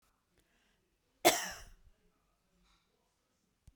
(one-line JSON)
{"cough_length": "3.8 s", "cough_amplitude": 9308, "cough_signal_mean_std_ratio": 0.18, "survey_phase": "beta (2021-08-13 to 2022-03-07)", "age": "45-64", "gender": "Female", "wearing_mask": "No", "symptom_runny_or_blocked_nose": true, "symptom_fatigue": true, "symptom_headache": true, "symptom_onset": "7 days", "smoker_status": "Never smoked", "respiratory_condition_asthma": false, "respiratory_condition_other": false, "recruitment_source": "REACT", "submission_delay": "0 days", "covid_test_result": "Negative", "covid_test_method": "RT-qPCR"}